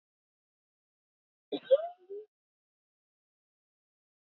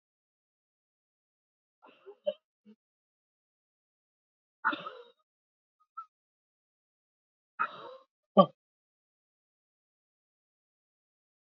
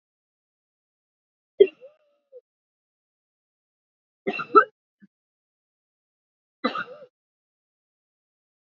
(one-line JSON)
{"cough_length": "4.4 s", "cough_amplitude": 6865, "cough_signal_mean_std_ratio": 0.16, "exhalation_length": "11.4 s", "exhalation_amplitude": 16763, "exhalation_signal_mean_std_ratio": 0.12, "three_cough_length": "8.8 s", "three_cough_amplitude": 26085, "three_cough_signal_mean_std_ratio": 0.14, "survey_phase": "beta (2021-08-13 to 2022-03-07)", "age": "45-64", "gender": "Female", "wearing_mask": "No", "symptom_sore_throat": true, "symptom_fatigue": true, "symptom_headache": true, "symptom_onset": "5 days", "smoker_status": "Never smoked", "respiratory_condition_asthma": false, "respiratory_condition_other": false, "recruitment_source": "Test and Trace", "submission_delay": "3 days", "covid_test_result": "Negative", "covid_test_method": "ePCR"}